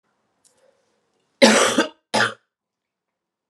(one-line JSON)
{"cough_length": "3.5 s", "cough_amplitude": 32763, "cough_signal_mean_std_ratio": 0.31, "survey_phase": "alpha (2021-03-01 to 2021-08-12)", "age": "45-64", "gender": "Female", "wearing_mask": "No", "symptom_cough_any": true, "symptom_headache": true, "symptom_onset": "3 days", "smoker_status": "Ex-smoker", "respiratory_condition_asthma": false, "respiratory_condition_other": false, "recruitment_source": "Test and Trace", "submission_delay": "2 days", "covid_test_result": "Positive", "covid_test_method": "RT-qPCR", "covid_ct_value": 19.6, "covid_ct_gene": "ORF1ab gene", "covid_ct_mean": 20.9, "covid_viral_load": "140000 copies/ml", "covid_viral_load_category": "Low viral load (10K-1M copies/ml)"}